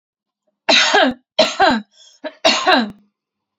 {"three_cough_length": "3.6 s", "three_cough_amplitude": 32767, "three_cough_signal_mean_std_ratio": 0.5, "survey_phase": "beta (2021-08-13 to 2022-03-07)", "age": "18-44", "gender": "Female", "wearing_mask": "No", "symptom_none": true, "smoker_status": "Ex-smoker", "respiratory_condition_asthma": true, "respiratory_condition_other": false, "recruitment_source": "REACT", "submission_delay": "1 day", "covid_test_result": "Negative", "covid_test_method": "RT-qPCR", "influenza_a_test_result": "Negative", "influenza_b_test_result": "Negative"}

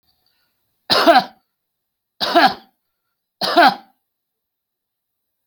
{"three_cough_length": "5.5 s", "three_cough_amplitude": 30060, "three_cough_signal_mean_std_ratio": 0.32, "survey_phase": "beta (2021-08-13 to 2022-03-07)", "age": "65+", "gender": "Male", "wearing_mask": "No", "symptom_none": true, "smoker_status": "Never smoked", "respiratory_condition_asthma": false, "respiratory_condition_other": false, "recruitment_source": "REACT", "submission_delay": "3 days", "covid_test_result": "Negative", "covid_test_method": "RT-qPCR"}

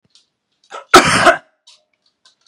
{"cough_length": "2.5 s", "cough_amplitude": 32768, "cough_signal_mean_std_ratio": 0.32, "survey_phase": "beta (2021-08-13 to 2022-03-07)", "age": "18-44", "gender": "Male", "wearing_mask": "No", "symptom_none": true, "smoker_status": "Never smoked", "respiratory_condition_asthma": false, "respiratory_condition_other": false, "recruitment_source": "REACT", "submission_delay": "1 day", "covid_test_result": "Negative", "covid_test_method": "RT-qPCR", "influenza_a_test_result": "Negative", "influenza_b_test_result": "Negative"}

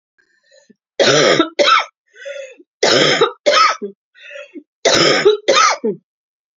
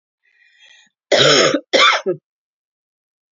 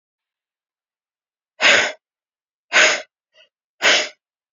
{"three_cough_length": "6.6 s", "three_cough_amplitude": 32767, "three_cough_signal_mean_std_ratio": 0.55, "cough_length": "3.3 s", "cough_amplitude": 32254, "cough_signal_mean_std_ratio": 0.41, "exhalation_length": "4.5 s", "exhalation_amplitude": 30256, "exhalation_signal_mean_std_ratio": 0.33, "survey_phase": "beta (2021-08-13 to 2022-03-07)", "age": "18-44", "gender": "Female", "wearing_mask": "No", "symptom_cough_any": true, "symptom_runny_or_blocked_nose": true, "symptom_fatigue": true, "symptom_onset": "3 days", "smoker_status": "Never smoked", "respiratory_condition_asthma": false, "respiratory_condition_other": false, "recruitment_source": "Test and Trace", "submission_delay": "1 day", "covid_test_result": "Positive", "covid_test_method": "RT-qPCR", "covid_ct_value": 20.3, "covid_ct_gene": "N gene"}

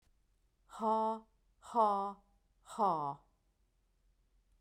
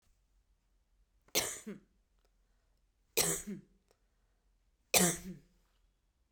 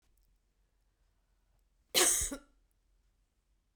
{"exhalation_length": "4.6 s", "exhalation_amplitude": 3949, "exhalation_signal_mean_std_ratio": 0.42, "three_cough_length": "6.3 s", "three_cough_amplitude": 8569, "three_cough_signal_mean_std_ratio": 0.28, "cough_length": "3.8 s", "cough_amplitude": 7385, "cough_signal_mean_std_ratio": 0.25, "survey_phase": "beta (2021-08-13 to 2022-03-07)", "age": "45-64", "gender": "Female", "wearing_mask": "No", "symptom_none": true, "smoker_status": "Never smoked", "respiratory_condition_asthma": false, "respiratory_condition_other": false, "recruitment_source": "REACT", "submission_delay": "1 day", "covid_test_result": "Negative", "covid_test_method": "RT-qPCR"}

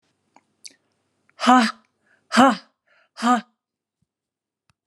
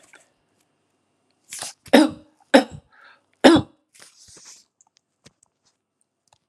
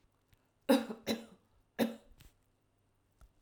{"exhalation_length": "4.9 s", "exhalation_amplitude": 29950, "exhalation_signal_mean_std_ratio": 0.29, "three_cough_length": "6.5 s", "three_cough_amplitude": 32768, "three_cough_signal_mean_std_ratio": 0.21, "cough_length": "3.4 s", "cough_amplitude": 5980, "cough_signal_mean_std_ratio": 0.27, "survey_phase": "alpha (2021-03-01 to 2021-08-12)", "age": "65+", "gender": "Female", "wearing_mask": "No", "symptom_none": true, "smoker_status": "Never smoked", "respiratory_condition_asthma": false, "respiratory_condition_other": false, "recruitment_source": "REACT", "submission_delay": "1 day", "covid_test_result": "Negative", "covid_test_method": "RT-qPCR"}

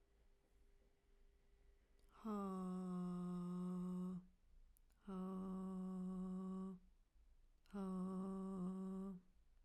{"exhalation_length": "9.6 s", "exhalation_amplitude": 411, "exhalation_signal_mean_std_ratio": 0.86, "survey_phase": "beta (2021-08-13 to 2022-03-07)", "age": "18-44", "gender": "Female", "wearing_mask": "No", "symptom_none": true, "smoker_status": "Never smoked", "respiratory_condition_asthma": false, "respiratory_condition_other": false, "recruitment_source": "REACT", "submission_delay": "3 days", "covid_test_result": "Negative", "covid_test_method": "RT-qPCR", "influenza_a_test_result": "Negative", "influenza_b_test_result": "Negative"}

